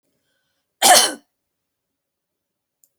{
  "cough_length": "3.0 s",
  "cough_amplitude": 32768,
  "cough_signal_mean_std_ratio": 0.24,
  "survey_phase": "alpha (2021-03-01 to 2021-08-12)",
  "age": "45-64",
  "gender": "Female",
  "wearing_mask": "No",
  "symptom_none": true,
  "smoker_status": "Never smoked",
  "respiratory_condition_asthma": false,
  "respiratory_condition_other": false,
  "recruitment_source": "REACT",
  "submission_delay": "2 days",
  "covid_test_result": "Negative",
  "covid_test_method": "RT-qPCR"
}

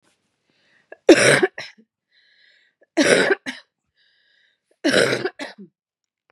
{
  "three_cough_length": "6.3 s",
  "three_cough_amplitude": 32767,
  "three_cough_signal_mean_std_ratio": 0.33,
  "survey_phase": "beta (2021-08-13 to 2022-03-07)",
  "age": "45-64",
  "gender": "Female",
  "wearing_mask": "No",
  "symptom_cough_any": true,
  "symptom_new_continuous_cough": true,
  "symptom_runny_or_blocked_nose": true,
  "symptom_fatigue": true,
  "symptom_change_to_sense_of_smell_or_taste": true,
  "symptom_onset": "3 days",
  "smoker_status": "Ex-smoker",
  "respiratory_condition_asthma": false,
  "respiratory_condition_other": false,
  "recruitment_source": "Test and Trace",
  "submission_delay": "2 days",
  "covid_test_result": "Positive",
  "covid_test_method": "RT-qPCR",
  "covid_ct_value": 21.6,
  "covid_ct_gene": "ORF1ab gene",
  "covid_ct_mean": 22.1,
  "covid_viral_load": "57000 copies/ml",
  "covid_viral_load_category": "Low viral load (10K-1M copies/ml)"
}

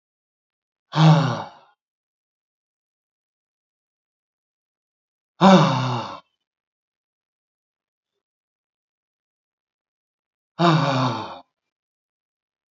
{
  "exhalation_length": "12.7 s",
  "exhalation_amplitude": 27239,
  "exhalation_signal_mean_std_ratio": 0.27,
  "survey_phase": "beta (2021-08-13 to 2022-03-07)",
  "age": "65+",
  "gender": "Male",
  "wearing_mask": "No",
  "symptom_none": true,
  "smoker_status": "Never smoked",
  "respiratory_condition_asthma": false,
  "respiratory_condition_other": false,
  "recruitment_source": "Test and Trace",
  "submission_delay": "1 day",
  "covid_test_result": "Positive",
  "covid_test_method": "RT-qPCR",
  "covid_ct_value": 36.2,
  "covid_ct_gene": "ORF1ab gene"
}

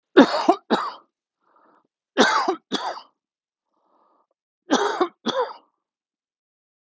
{
  "three_cough_length": "6.9 s",
  "three_cough_amplitude": 31542,
  "three_cough_signal_mean_std_ratio": 0.34,
  "survey_phase": "alpha (2021-03-01 to 2021-08-12)",
  "age": "65+",
  "gender": "Male",
  "wearing_mask": "No",
  "symptom_cough_any": true,
  "symptom_fatigue": true,
  "symptom_headache": true,
  "symptom_onset": "5 days",
  "smoker_status": "Ex-smoker",
  "respiratory_condition_asthma": false,
  "respiratory_condition_other": false,
  "recruitment_source": "Test and Trace",
  "submission_delay": "2 days",
  "covid_test_result": "Positive",
  "covid_test_method": "RT-qPCR",
  "covid_ct_value": 33.3,
  "covid_ct_gene": "ORF1ab gene"
}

